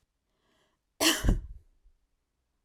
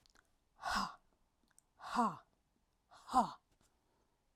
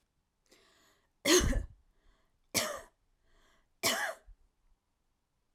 {"cough_length": "2.6 s", "cough_amplitude": 10683, "cough_signal_mean_std_ratio": 0.31, "exhalation_length": "4.4 s", "exhalation_amplitude": 3618, "exhalation_signal_mean_std_ratio": 0.31, "three_cough_length": "5.5 s", "three_cough_amplitude": 8461, "three_cough_signal_mean_std_ratio": 0.31, "survey_phase": "beta (2021-08-13 to 2022-03-07)", "age": "18-44", "gender": "Female", "wearing_mask": "No", "symptom_none": true, "smoker_status": "Never smoked", "respiratory_condition_asthma": false, "respiratory_condition_other": false, "recruitment_source": "REACT", "submission_delay": "2 days", "covid_test_result": "Negative", "covid_test_method": "RT-qPCR"}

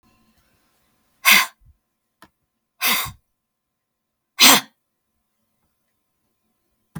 {"exhalation_length": "7.0 s", "exhalation_amplitude": 32768, "exhalation_signal_mean_std_ratio": 0.23, "survey_phase": "beta (2021-08-13 to 2022-03-07)", "age": "45-64", "gender": "Female", "wearing_mask": "No", "symptom_shortness_of_breath": true, "smoker_status": "Never smoked", "respiratory_condition_asthma": false, "respiratory_condition_other": false, "recruitment_source": "REACT", "submission_delay": "2 days", "covid_test_result": "Negative", "covid_test_method": "RT-qPCR", "influenza_a_test_result": "Negative", "influenza_b_test_result": "Negative"}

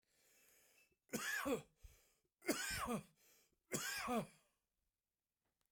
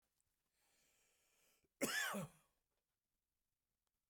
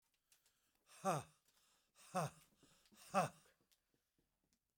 {"three_cough_length": "5.7 s", "three_cough_amplitude": 1857, "three_cough_signal_mean_std_ratio": 0.45, "cough_length": "4.1 s", "cough_amplitude": 1477, "cough_signal_mean_std_ratio": 0.28, "exhalation_length": "4.8 s", "exhalation_amplitude": 1978, "exhalation_signal_mean_std_ratio": 0.26, "survey_phase": "beta (2021-08-13 to 2022-03-07)", "age": "65+", "gender": "Male", "wearing_mask": "No", "symptom_none": true, "symptom_onset": "13 days", "smoker_status": "Ex-smoker", "respiratory_condition_asthma": false, "respiratory_condition_other": false, "recruitment_source": "REACT", "submission_delay": "3 days", "covid_test_result": "Negative", "covid_test_method": "RT-qPCR"}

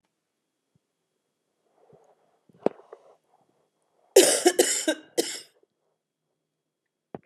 {"cough_length": "7.3 s", "cough_amplitude": 24398, "cough_signal_mean_std_ratio": 0.23, "survey_phase": "beta (2021-08-13 to 2022-03-07)", "age": "45-64", "gender": "Female", "wearing_mask": "No", "symptom_fatigue": true, "symptom_headache": true, "symptom_change_to_sense_of_smell_or_taste": true, "smoker_status": "Ex-smoker", "respiratory_condition_asthma": false, "respiratory_condition_other": false, "recruitment_source": "Test and Trace", "submission_delay": "1 day", "covid_test_result": "Positive", "covid_test_method": "RT-qPCR", "covid_ct_value": 16.0, "covid_ct_gene": "ORF1ab gene"}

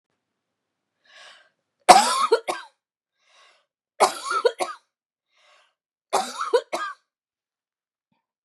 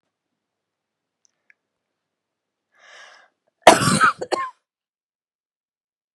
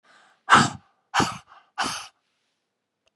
{"three_cough_length": "8.4 s", "three_cough_amplitude": 32768, "three_cough_signal_mean_std_ratio": 0.27, "cough_length": "6.1 s", "cough_amplitude": 32768, "cough_signal_mean_std_ratio": 0.21, "exhalation_length": "3.2 s", "exhalation_amplitude": 27353, "exhalation_signal_mean_std_ratio": 0.3, "survey_phase": "beta (2021-08-13 to 2022-03-07)", "age": "45-64", "gender": "Female", "wearing_mask": "No", "symptom_new_continuous_cough": true, "symptom_runny_or_blocked_nose": true, "symptom_fatigue": true, "symptom_fever_high_temperature": true, "symptom_headache": true, "symptom_change_to_sense_of_smell_or_taste": true, "symptom_loss_of_taste": true, "symptom_onset": "3 days", "smoker_status": "Never smoked", "respiratory_condition_asthma": false, "respiratory_condition_other": false, "recruitment_source": "Test and Trace", "submission_delay": "2 days", "covid_test_result": "Positive", "covid_test_method": "RT-qPCR", "covid_ct_value": 14.4, "covid_ct_gene": "ORF1ab gene", "covid_ct_mean": 15.5, "covid_viral_load": "8300000 copies/ml", "covid_viral_load_category": "High viral load (>1M copies/ml)"}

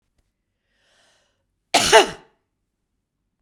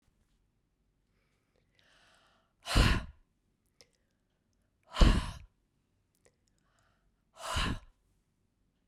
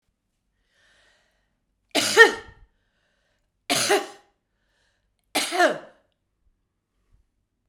{"cough_length": "3.4 s", "cough_amplitude": 32768, "cough_signal_mean_std_ratio": 0.22, "exhalation_length": "8.9 s", "exhalation_amplitude": 11188, "exhalation_signal_mean_std_ratio": 0.23, "three_cough_length": "7.7 s", "three_cough_amplitude": 32062, "three_cough_signal_mean_std_ratio": 0.25, "survey_phase": "beta (2021-08-13 to 2022-03-07)", "age": "65+", "gender": "Female", "wearing_mask": "No", "symptom_fatigue": true, "symptom_change_to_sense_of_smell_or_taste": true, "symptom_onset": "7 days", "smoker_status": "Ex-smoker", "respiratory_condition_asthma": false, "respiratory_condition_other": false, "recruitment_source": "Test and Trace", "submission_delay": "1 day", "covid_test_result": "Positive", "covid_test_method": "ePCR"}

